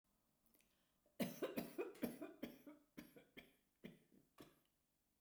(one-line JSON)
{"cough_length": "5.2 s", "cough_amplitude": 1065, "cough_signal_mean_std_ratio": 0.39, "survey_phase": "beta (2021-08-13 to 2022-03-07)", "age": "65+", "gender": "Female", "wearing_mask": "No", "symptom_none": true, "smoker_status": "Ex-smoker", "respiratory_condition_asthma": false, "respiratory_condition_other": false, "recruitment_source": "REACT", "submission_delay": "1 day", "covid_test_result": "Negative", "covid_test_method": "RT-qPCR"}